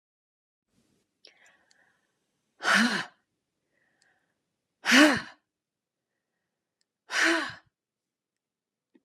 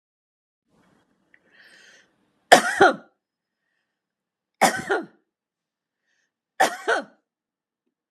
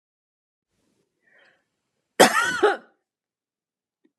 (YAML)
exhalation_length: 9.0 s
exhalation_amplitude: 17804
exhalation_signal_mean_std_ratio: 0.26
three_cough_length: 8.1 s
three_cough_amplitude: 32768
three_cough_signal_mean_std_ratio: 0.23
cough_length: 4.2 s
cough_amplitude: 32303
cough_signal_mean_std_ratio: 0.24
survey_phase: beta (2021-08-13 to 2022-03-07)
age: 65+
gender: Female
wearing_mask: 'No'
symptom_none: true
smoker_status: Ex-smoker
respiratory_condition_asthma: false
respiratory_condition_other: false
recruitment_source: REACT
submission_delay: 3 days
covid_test_result: Negative
covid_test_method: RT-qPCR
influenza_a_test_result: Negative
influenza_b_test_result: Negative